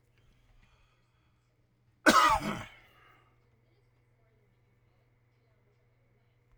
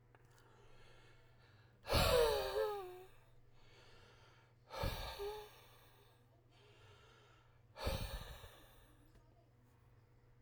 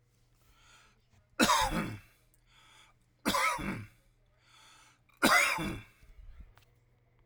{"cough_length": "6.6 s", "cough_amplitude": 14443, "cough_signal_mean_std_ratio": 0.22, "exhalation_length": "10.4 s", "exhalation_amplitude": 2522, "exhalation_signal_mean_std_ratio": 0.4, "three_cough_length": "7.3 s", "three_cough_amplitude": 10791, "three_cough_signal_mean_std_ratio": 0.38, "survey_phase": "alpha (2021-03-01 to 2021-08-12)", "age": "45-64", "gender": "Male", "wearing_mask": "No", "symptom_none": true, "smoker_status": "Ex-smoker", "respiratory_condition_asthma": false, "respiratory_condition_other": false, "recruitment_source": "REACT", "submission_delay": "1 day", "covid_test_result": "Negative", "covid_test_method": "RT-qPCR"}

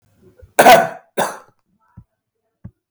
{"cough_length": "2.9 s", "cough_amplitude": 32768, "cough_signal_mean_std_ratio": 0.29, "survey_phase": "beta (2021-08-13 to 2022-03-07)", "age": "65+", "gender": "Male", "wearing_mask": "No", "symptom_cough_any": true, "symptom_runny_or_blocked_nose": true, "symptom_change_to_sense_of_smell_or_taste": true, "symptom_onset": "5 days", "smoker_status": "Ex-smoker", "respiratory_condition_asthma": false, "respiratory_condition_other": false, "recruitment_source": "REACT", "submission_delay": "2 days", "covid_test_result": "Negative", "covid_test_method": "RT-qPCR", "influenza_a_test_result": "Unknown/Void", "influenza_b_test_result": "Unknown/Void"}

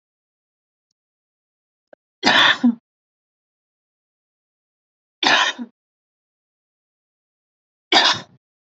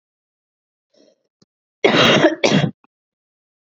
{"three_cough_length": "8.8 s", "three_cough_amplitude": 30665, "three_cough_signal_mean_std_ratio": 0.26, "cough_length": "3.7 s", "cough_amplitude": 31130, "cough_signal_mean_std_ratio": 0.37, "survey_phase": "beta (2021-08-13 to 2022-03-07)", "age": "18-44", "gender": "Female", "wearing_mask": "No", "symptom_cough_any": true, "symptom_shortness_of_breath": true, "symptom_sore_throat": true, "smoker_status": "Ex-smoker", "respiratory_condition_asthma": false, "respiratory_condition_other": false, "recruitment_source": "REACT", "submission_delay": "2 days", "covid_test_result": "Negative", "covid_test_method": "RT-qPCR", "influenza_a_test_result": "Negative", "influenza_b_test_result": "Negative"}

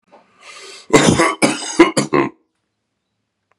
{"cough_length": "3.6 s", "cough_amplitude": 32768, "cough_signal_mean_std_ratio": 0.41, "survey_phase": "beta (2021-08-13 to 2022-03-07)", "age": "45-64", "gender": "Male", "wearing_mask": "No", "symptom_cough_any": true, "symptom_runny_or_blocked_nose": true, "symptom_shortness_of_breath": true, "symptom_sore_throat": true, "symptom_abdominal_pain": true, "symptom_fatigue": true, "symptom_fever_high_temperature": true, "symptom_headache": true, "symptom_change_to_sense_of_smell_or_taste": true, "symptom_loss_of_taste": true, "symptom_other": true, "symptom_onset": "4 days", "smoker_status": "Ex-smoker", "respiratory_condition_asthma": false, "respiratory_condition_other": false, "recruitment_source": "Test and Trace", "submission_delay": "1 day", "covid_test_result": "Positive", "covid_test_method": "RT-qPCR", "covid_ct_value": 17.4, "covid_ct_gene": "ORF1ab gene", "covid_ct_mean": 17.7, "covid_viral_load": "1500000 copies/ml", "covid_viral_load_category": "High viral load (>1M copies/ml)"}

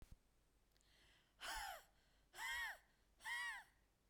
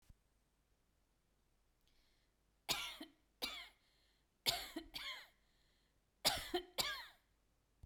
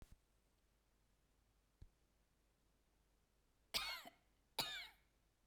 {"exhalation_length": "4.1 s", "exhalation_amplitude": 539, "exhalation_signal_mean_std_ratio": 0.52, "three_cough_length": "7.9 s", "three_cough_amplitude": 4047, "three_cough_signal_mean_std_ratio": 0.33, "cough_length": "5.5 s", "cough_amplitude": 1996, "cough_signal_mean_std_ratio": 0.29, "survey_phase": "beta (2021-08-13 to 2022-03-07)", "age": "45-64", "gender": "Female", "wearing_mask": "No", "symptom_none": true, "smoker_status": "Never smoked", "respiratory_condition_asthma": false, "respiratory_condition_other": false, "recruitment_source": "REACT", "submission_delay": "1 day", "covid_test_result": "Negative", "covid_test_method": "RT-qPCR", "influenza_a_test_result": "Negative", "influenza_b_test_result": "Negative"}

